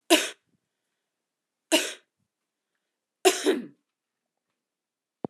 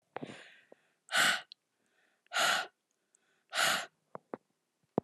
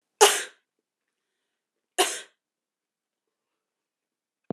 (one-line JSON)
{"three_cough_length": "5.3 s", "three_cough_amplitude": 21446, "three_cough_signal_mean_std_ratio": 0.25, "exhalation_length": "5.0 s", "exhalation_amplitude": 7392, "exhalation_signal_mean_std_ratio": 0.36, "cough_length": "4.5 s", "cough_amplitude": 29417, "cough_signal_mean_std_ratio": 0.19, "survey_phase": "alpha (2021-03-01 to 2021-08-12)", "age": "18-44", "gender": "Female", "wearing_mask": "No", "symptom_none": true, "smoker_status": "Never smoked", "respiratory_condition_asthma": false, "respiratory_condition_other": false, "recruitment_source": "REACT", "submission_delay": "2 days", "covid_test_result": "Negative", "covid_test_method": "RT-qPCR"}